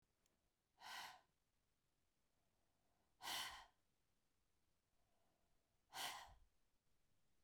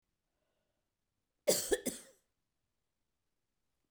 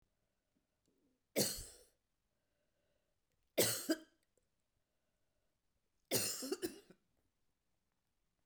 {"exhalation_length": "7.4 s", "exhalation_amplitude": 497, "exhalation_signal_mean_std_ratio": 0.34, "cough_length": "3.9 s", "cough_amplitude": 4717, "cough_signal_mean_std_ratio": 0.22, "three_cough_length": "8.5 s", "three_cough_amplitude": 3544, "three_cough_signal_mean_std_ratio": 0.28, "survey_phase": "beta (2021-08-13 to 2022-03-07)", "age": "45-64", "gender": "Female", "wearing_mask": "No", "symptom_runny_or_blocked_nose": true, "symptom_fatigue": true, "symptom_headache": true, "symptom_onset": "4 days", "smoker_status": "Ex-smoker", "respiratory_condition_asthma": false, "respiratory_condition_other": false, "recruitment_source": "Test and Trace", "submission_delay": "2 days", "covid_test_result": "Positive", "covid_test_method": "RT-qPCR", "covid_ct_value": 14.4, "covid_ct_gene": "ORF1ab gene"}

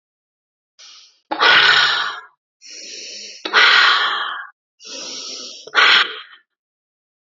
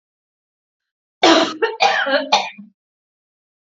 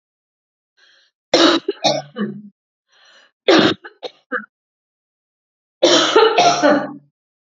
{"exhalation_length": "7.3 s", "exhalation_amplitude": 31555, "exhalation_signal_mean_std_ratio": 0.47, "cough_length": "3.7 s", "cough_amplitude": 31781, "cough_signal_mean_std_ratio": 0.41, "three_cough_length": "7.4 s", "three_cough_amplitude": 32767, "three_cough_signal_mean_std_ratio": 0.42, "survey_phase": "alpha (2021-03-01 to 2021-08-12)", "age": "45-64", "gender": "Female", "wearing_mask": "No", "symptom_none": true, "smoker_status": "Never smoked", "respiratory_condition_asthma": false, "respiratory_condition_other": false, "recruitment_source": "REACT", "submission_delay": "1 day", "covid_test_result": "Negative", "covid_test_method": "RT-qPCR"}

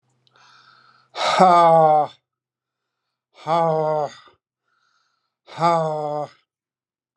{"exhalation_length": "7.2 s", "exhalation_amplitude": 29170, "exhalation_signal_mean_std_ratio": 0.42, "survey_phase": "alpha (2021-03-01 to 2021-08-12)", "age": "65+", "gender": "Male", "wearing_mask": "No", "symptom_none": true, "smoker_status": "Ex-smoker", "respiratory_condition_asthma": false, "respiratory_condition_other": false, "recruitment_source": "REACT", "submission_delay": "3 days", "covid_test_result": "Negative", "covid_test_method": "RT-qPCR"}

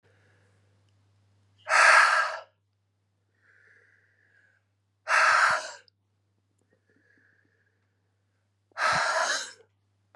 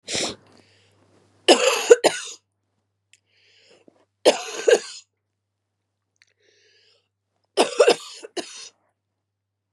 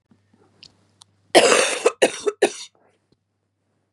{"exhalation_length": "10.2 s", "exhalation_amplitude": 14500, "exhalation_signal_mean_std_ratio": 0.34, "three_cough_length": "9.7 s", "three_cough_amplitude": 32768, "three_cough_signal_mean_std_ratio": 0.27, "cough_length": "3.9 s", "cough_amplitude": 32294, "cough_signal_mean_std_ratio": 0.33, "survey_phase": "beta (2021-08-13 to 2022-03-07)", "age": "45-64", "gender": "Female", "wearing_mask": "No", "symptom_cough_any": true, "symptom_runny_or_blocked_nose": true, "symptom_sore_throat": true, "symptom_fatigue": true, "symptom_headache": true, "symptom_change_to_sense_of_smell_or_taste": true, "symptom_onset": "6 days", "smoker_status": "Never smoked", "respiratory_condition_asthma": false, "respiratory_condition_other": false, "recruitment_source": "Test and Trace", "submission_delay": "2 days", "covid_test_result": "Positive", "covid_test_method": "ePCR"}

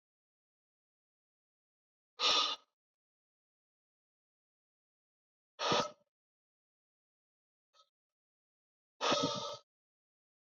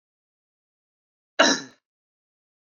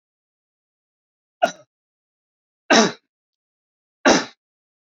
{"exhalation_length": "10.4 s", "exhalation_amplitude": 4150, "exhalation_signal_mean_std_ratio": 0.25, "cough_length": "2.7 s", "cough_amplitude": 25171, "cough_signal_mean_std_ratio": 0.2, "three_cough_length": "4.9 s", "three_cough_amplitude": 29796, "three_cough_signal_mean_std_ratio": 0.23, "survey_phase": "beta (2021-08-13 to 2022-03-07)", "age": "18-44", "gender": "Male", "wearing_mask": "No", "symptom_none": true, "smoker_status": "Current smoker (e-cigarettes or vapes only)", "respiratory_condition_asthma": false, "respiratory_condition_other": false, "recruitment_source": "Test and Trace", "submission_delay": "2 days", "covid_test_result": "Negative", "covid_test_method": "RT-qPCR"}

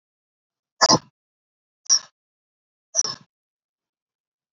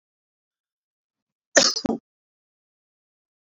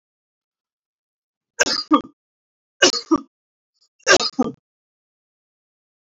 {"exhalation_length": "4.5 s", "exhalation_amplitude": 27607, "exhalation_signal_mean_std_ratio": 0.21, "cough_length": "3.6 s", "cough_amplitude": 25988, "cough_signal_mean_std_ratio": 0.2, "three_cough_length": "6.1 s", "three_cough_amplitude": 28395, "three_cough_signal_mean_std_ratio": 0.26, "survey_phase": "beta (2021-08-13 to 2022-03-07)", "age": "18-44", "gender": "Male", "wearing_mask": "No", "symptom_none": true, "smoker_status": "Never smoked", "respiratory_condition_asthma": true, "respiratory_condition_other": false, "recruitment_source": "Test and Trace", "submission_delay": "2 days", "covid_test_result": "Negative", "covid_test_method": "RT-qPCR"}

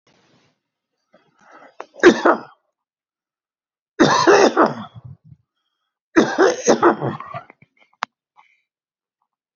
{"three_cough_length": "9.6 s", "three_cough_amplitude": 31490, "three_cough_signal_mean_std_ratio": 0.33, "survey_phase": "beta (2021-08-13 to 2022-03-07)", "age": "65+", "gender": "Male", "wearing_mask": "No", "symptom_none": true, "smoker_status": "Ex-smoker", "respiratory_condition_asthma": false, "respiratory_condition_other": false, "recruitment_source": "REACT", "submission_delay": "2 days", "covid_test_result": "Negative", "covid_test_method": "RT-qPCR", "influenza_a_test_result": "Negative", "influenza_b_test_result": "Negative"}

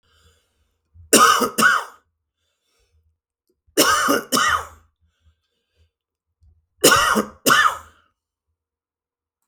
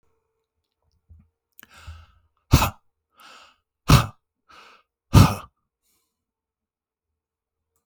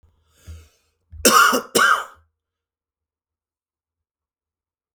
{"three_cough_length": "9.5 s", "three_cough_amplitude": 32768, "three_cough_signal_mean_std_ratio": 0.37, "exhalation_length": "7.9 s", "exhalation_amplitude": 32738, "exhalation_signal_mean_std_ratio": 0.2, "cough_length": "4.9 s", "cough_amplitude": 32768, "cough_signal_mean_std_ratio": 0.29, "survey_phase": "beta (2021-08-13 to 2022-03-07)", "age": "45-64", "gender": "Male", "wearing_mask": "No", "symptom_fever_high_temperature": true, "symptom_loss_of_taste": true, "symptom_onset": "9 days", "smoker_status": "Ex-smoker", "respiratory_condition_asthma": false, "respiratory_condition_other": false, "recruitment_source": "Test and Trace", "submission_delay": "1 day", "covid_test_result": "Positive", "covid_test_method": "RT-qPCR", "covid_ct_value": 27.3, "covid_ct_gene": "ORF1ab gene", "covid_ct_mean": 27.9, "covid_viral_load": "700 copies/ml", "covid_viral_load_category": "Minimal viral load (< 10K copies/ml)"}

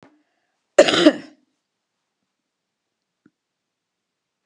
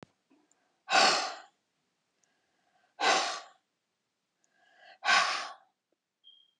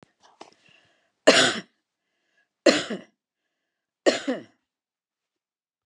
{"cough_length": "4.5 s", "cough_amplitude": 32768, "cough_signal_mean_std_ratio": 0.19, "exhalation_length": "6.6 s", "exhalation_amplitude": 10067, "exhalation_signal_mean_std_ratio": 0.33, "three_cough_length": "5.9 s", "three_cough_amplitude": 27178, "three_cough_signal_mean_std_ratio": 0.25, "survey_phase": "beta (2021-08-13 to 2022-03-07)", "age": "65+", "gender": "Female", "wearing_mask": "No", "symptom_none": true, "smoker_status": "Ex-smoker", "respiratory_condition_asthma": false, "respiratory_condition_other": false, "recruitment_source": "REACT", "submission_delay": "7 days", "covid_test_result": "Negative", "covid_test_method": "RT-qPCR"}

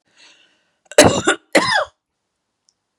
{"cough_length": "3.0 s", "cough_amplitude": 32768, "cough_signal_mean_std_ratio": 0.33, "survey_phase": "beta (2021-08-13 to 2022-03-07)", "age": "45-64", "gender": "Female", "wearing_mask": "No", "symptom_runny_or_blocked_nose": true, "symptom_onset": "8 days", "smoker_status": "Never smoked", "respiratory_condition_asthma": false, "respiratory_condition_other": false, "recruitment_source": "REACT", "submission_delay": "3 days", "covid_test_result": "Negative", "covid_test_method": "RT-qPCR", "influenza_a_test_result": "Negative", "influenza_b_test_result": "Negative"}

